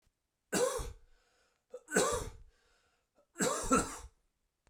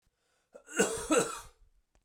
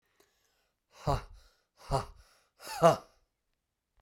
{"three_cough_length": "4.7 s", "three_cough_amplitude": 6533, "three_cough_signal_mean_std_ratio": 0.42, "cough_length": "2.0 s", "cough_amplitude": 7232, "cough_signal_mean_std_ratio": 0.4, "exhalation_length": "4.0 s", "exhalation_amplitude": 12220, "exhalation_signal_mean_std_ratio": 0.26, "survey_phase": "beta (2021-08-13 to 2022-03-07)", "age": "45-64", "gender": "Male", "wearing_mask": "No", "symptom_cough_any": true, "symptom_runny_or_blocked_nose": true, "symptom_onset": "3 days", "smoker_status": "Never smoked", "respiratory_condition_asthma": false, "respiratory_condition_other": false, "recruitment_source": "Test and Trace", "submission_delay": "2 days", "covid_test_result": "Positive", "covid_test_method": "RT-qPCR", "covid_ct_value": 17.1, "covid_ct_gene": "ORF1ab gene"}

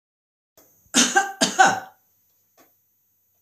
{"cough_length": "3.4 s", "cough_amplitude": 24476, "cough_signal_mean_std_ratio": 0.33, "survey_phase": "beta (2021-08-13 to 2022-03-07)", "age": "65+", "gender": "Female", "wearing_mask": "No", "symptom_none": true, "smoker_status": "Never smoked", "respiratory_condition_asthma": false, "respiratory_condition_other": false, "recruitment_source": "REACT", "submission_delay": "4 days", "covid_test_result": "Negative", "covid_test_method": "RT-qPCR"}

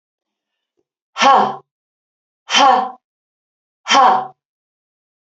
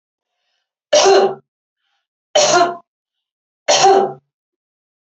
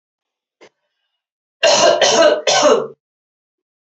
{"exhalation_length": "5.3 s", "exhalation_amplitude": 30243, "exhalation_signal_mean_std_ratio": 0.37, "three_cough_length": "5.0 s", "three_cough_amplitude": 31697, "three_cough_signal_mean_std_ratio": 0.41, "cough_length": "3.8 s", "cough_amplitude": 31792, "cough_signal_mean_std_ratio": 0.47, "survey_phase": "alpha (2021-03-01 to 2021-08-12)", "age": "45-64", "gender": "Female", "wearing_mask": "No", "symptom_none": true, "smoker_status": "Current smoker (e-cigarettes or vapes only)", "respiratory_condition_asthma": false, "respiratory_condition_other": true, "recruitment_source": "REACT", "submission_delay": "1 day", "covid_test_result": "Negative", "covid_test_method": "RT-qPCR"}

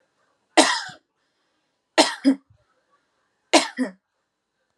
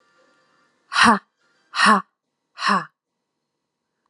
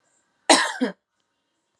{"three_cough_length": "4.8 s", "three_cough_amplitude": 31235, "three_cough_signal_mean_std_ratio": 0.28, "exhalation_length": "4.1 s", "exhalation_amplitude": 30676, "exhalation_signal_mean_std_ratio": 0.32, "cough_length": "1.8 s", "cough_amplitude": 29440, "cough_signal_mean_std_ratio": 0.3, "survey_phase": "alpha (2021-03-01 to 2021-08-12)", "age": "18-44", "gender": "Female", "wearing_mask": "No", "symptom_none": true, "smoker_status": "Never smoked", "respiratory_condition_asthma": true, "respiratory_condition_other": false, "recruitment_source": "Test and Trace", "submission_delay": "2 days", "covid_test_result": "Positive"}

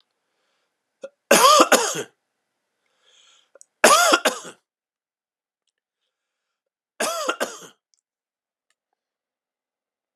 {"three_cough_length": "10.2 s", "three_cough_amplitude": 32310, "three_cough_signal_mean_std_ratio": 0.27, "survey_phase": "alpha (2021-03-01 to 2021-08-12)", "age": "18-44", "gender": "Male", "wearing_mask": "No", "symptom_none": true, "smoker_status": "Ex-smoker", "respiratory_condition_asthma": false, "respiratory_condition_other": false, "recruitment_source": "REACT", "submission_delay": "2 days", "covid_test_result": "Negative", "covid_test_method": "RT-qPCR", "covid_ct_value": 40.0, "covid_ct_gene": "N gene"}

